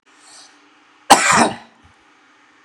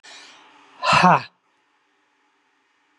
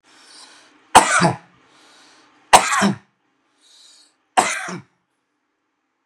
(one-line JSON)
{"cough_length": "2.6 s", "cough_amplitude": 32768, "cough_signal_mean_std_ratio": 0.31, "exhalation_length": "3.0 s", "exhalation_amplitude": 25437, "exhalation_signal_mean_std_ratio": 0.29, "three_cough_length": "6.1 s", "three_cough_amplitude": 32768, "three_cough_signal_mean_std_ratio": 0.3, "survey_phase": "beta (2021-08-13 to 2022-03-07)", "age": "65+", "gender": "Male", "wearing_mask": "No", "symptom_none": true, "smoker_status": "Ex-smoker", "respiratory_condition_asthma": false, "respiratory_condition_other": false, "recruitment_source": "REACT", "submission_delay": "3 days", "covid_test_result": "Negative", "covid_test_method": "RT-qPCR", "influenza_a_test_result": "Negative", "influenza_b_test_result": "Negative"}